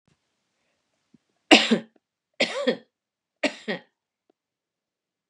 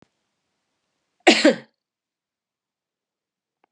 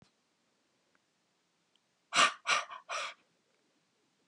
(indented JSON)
{
  "three_cough_length": "5.3 s",
  "three_cough_amplitude": 32075,
  "three_cough_signal_mean_std_ratio": 0.23,
  "cough_length": "3.7 s",
  "cough_amplitude": 28943,
  "cough_signal_mean_std_ratio": 0.2,
  "exhalation_length": "4.3 s",
  "exhalation_amplitude": 8390,
  "exhalation_signal_mean_std_ratio": 0.26,
  "survey_phase": "beta (2021-08-13 to 2022-03-07)",
  "age": "65+",
  "gender": "Female",
  "wearing_mask": "No",
  "symptom_none": true,
  "smoker_status": "Ex-smoker",
  "respiratory_condition_asthma": false,
  "respiratory_condition_other": false,
  "recruitment_source": "REACT",
  "submission_delay": "2 days",
  "covid_test_result": "Negative",
  "covid_test_method": "RT-qPCR",
  "influenza_a_test_result": "Negative",
  "influenza_b_test_result": "Negative"
}